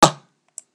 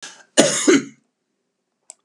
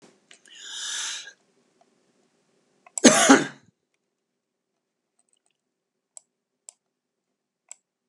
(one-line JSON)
{"exhalation_length": "0.7 s", "exhalation_amplitude": 32768, "exhalation_signal_mean_std_ratio": 0.23, "three_cough_length": "2.0 s", "three_cough_amplitude": 32768, "three_cough_signal_mean_std_ratio": 0.36, "cough_length": "8.1 s", "cough_amplitude": 32074, "cough_signal_mean_std_ratio": 0.2, "survey_phase": "beta (2021-08-13 to 2022-03-07)", "age": "65+", "gender": "Male", "wearing_mask": "No", "symptom_sore_throat": true, "smoker_status": "Ex-smoker", "respiratory_condition_asthma": false, "respiratory_condition_other": false, "recruitment_source": "REACT", "submission_delay": "3 days", "covid_test_result": "Negative", "covid_test_method": "RT-qPCR", "influenza_a_test_result": "Negative", "influenza_b_test_result": "Negative"}